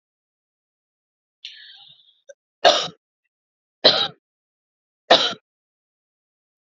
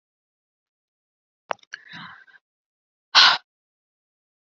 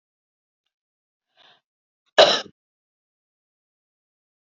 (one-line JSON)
{"three_cough_length": "6.7 s", "three_cough_amplitude": 30246, "three_cough_signal_mean_std_ratio": 0.23, "exhalation_length": "4.5 s", "exhalation_amplitude": 30735, "exhalation_signal_mean_std_ratio": 0.19, "cough_length": "4.4 s", "cough_amplitude": 27811, "cough_signal_mean_std_ratio": 0.16, "survey_phase": "beta (2021-08-13 to 2022-03-07)", "age": "18-44", "gender": "Female", "wearing_mask": "No", "symptom_runny_or_blocked_nose": true, "symptom_headache": true, "symptom_onset": "12 days", "smoker_status": "Never smoked", "respiratory_condition_asthma": false, "respiratory_condition_other": false, "recruitment_source": "REACT", "submission_delay": "-14 days", "covid_test_result": "Negative", "covid_test_method": "RT-qPCR", "influenza_a_test_result": "Unknown/Void", "influenza_b_test_result": "Unknown/Void"}